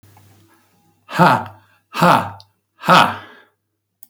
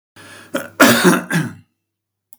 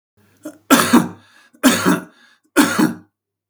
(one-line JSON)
{"exhalation_length": "4.1 s", "exhalation_amplitude": 32768, "exhalation_signal_mean_std_ratio": 0.36, "cough_length": "2.4 s", "cough_amplitude": 32768, "cough_signal_mean_std_ratio": 0.43, "three_cough_length": "3.5 s", "three_cough_amplitude": 32768, "three_cough_signal_mean_std_ratio": 0.44, "survey_phase": "beta (2021-08-13 to 2022-03-07)", "age": "65+", "gender": "Male", "wearing_mask": "No", "symptom_none": true, "smoker_status": "Never smoked", "respiratory_condition_asthma": false, "respiratory_condition_other": false, "recruitment_source": "REACT", "submission_delay": "1 day", "covid_test_result": "Negative", "covid_test_method": "RT-qPCR", "influenza_a_test_result": "Negative", "influenza_b_test_result": "Negative"}